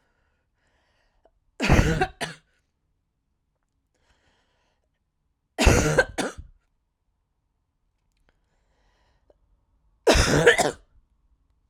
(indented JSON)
{
  "three_cough_length": "11.7 s",
  "three_cough_amplitude": 26054,
  "three_cough_signal_mean_std_ratio": 0.29,
  "survey_phase": "alpha (2021-03-01 to 2021-08-12)",
  "age": "18-44",
  "gender": "Female",
  "wearing_mask": "No",
  "symptom_none": true,
  "smoker_status": "Never smoked",
  "respiratory_condition_asthma": true,
  "respiratory_condition_other": false,
  "recruitment_source": "REACT",
  "submission_delay": "5 days",
  "covid_test_result": "Negative",
  "covid_test_method": "RT-qPCR"
}